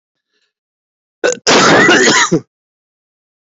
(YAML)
cough_length: 3.6 s
cough_amplitude: 31875
cough_signal_mean_std_ratio: 0.47
survey_phase: beta (2021-08-13 to 2022-03-07)
age: 45-64
gender: Male
wearing_mask: 'Yes'
symptom_cough_any: true
symptom_runny_or_blocked_nose: true
symptom_shortness_of_breath: true
symptom_sore_throat: true
symptom_headache: true
symptom_change_to_sense_of_smell_or_taste: true
symptom_other: true
symptom_onset: 2 days
smoker_status: Never smoked
respiratory_condition_asthma: false
respiratory_condition_other: false
recruitment_source: Test and Trace
submission_delay: 2 days
covid_test_result: Positive
covid_test_method: RT-qPCR
covid_ct_value: 17.3
covid_ct_gene: N gene